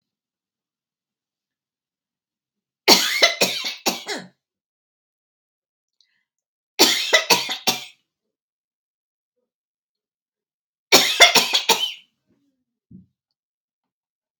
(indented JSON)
{
  "three_cough_length": "14.4 s",
  "three_cough_amplitude": 32768,
  "three_cough_signal_mean_std_ratio": 0.28,
  "survey_phase": "beta (2021-08-13 to 2022-03-07)",
  "age": "45-64",
  "gender": "Female",
  "wearing_mask": "No",
  "symptom_sore_throat": true,
  "symptom_headache": true,
  "smoker_status": "Never smoked",
  "respiratory_condition_asthma": false,
  "respiratory_condition_other": false,
  "recruitment_source": "REACT",
  "submission_delay": "1 day",
  "covid_test_result": "Negative",
  "covid_test_method": "RT-qPCR"
}